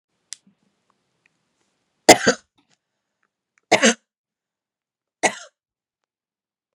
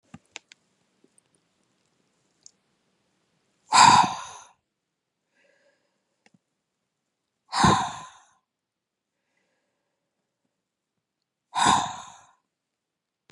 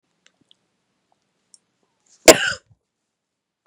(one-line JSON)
{"three_cough_length": "6.7 s", "three_cough_amplitude": 32768, "three_cough_signal_mean_std_ratio": 0.18, "exhalation_length": "13.3 s", "exhalation_amplitude": 25510, "exhalation_signal_mean_std_ratio": 0.22, "cough_length": "3.7 s", "cough_amplitude": 32768, "cough_signal_mean_std_ratio": 0.15, "survey_phase": "beta (2021-08-13 to 2022-03-07)", "age": "18-44", "gender": "Female", "wearing_mask": "No", "symptom_headache": true, "symptom_onset": "4 days", "smoker_status": "Current smoker (e-cigarettes or vapes only)", "respiratory_condition_asthma": false, "respiratory_condition_other": false, "recruitment_source": "REACT", "submission_delay": "2 days", "covid_test_result": "Negative", "covid_test_method": "RT-qPCR", "influenza_a_test_result": "Negative", "influenza_b_test_result": "Negative"}